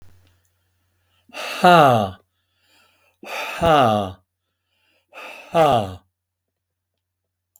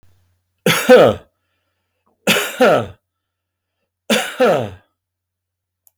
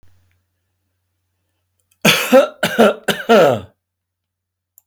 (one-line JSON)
{"exhalation_length": "7.6 s", "exhalation_amplitude": 32766, "exhalation_signal_mean_std_ratio": 0.35, "three_cough_length": "6.0 s", "three_cough_amplitude": 32548, "three_cough_signal_mean_std_ratio": 0.38, "cough_length": "4.9 s", "cough_amplitude": 32766, "cough_signal_mean_std_ratio": 0.38, "survey_phase": "beta (2021-08-13 to 2022-03-07)", "age": "65+", "gender": "Male", "wearing_mask": "No", "symptom_none": true, "smoker_status": "Never smoked", "respiratory_condition_asthma": false, "respiratory_condition_other": false, "recruitment_source": "REACT", "submission_delay": "1 day", "covid_test_result": "Negative", "covid_test_method": "RT-qPCR", "influenza_a_test_result": "Negative", "influenza_b_test_result": "Negative"}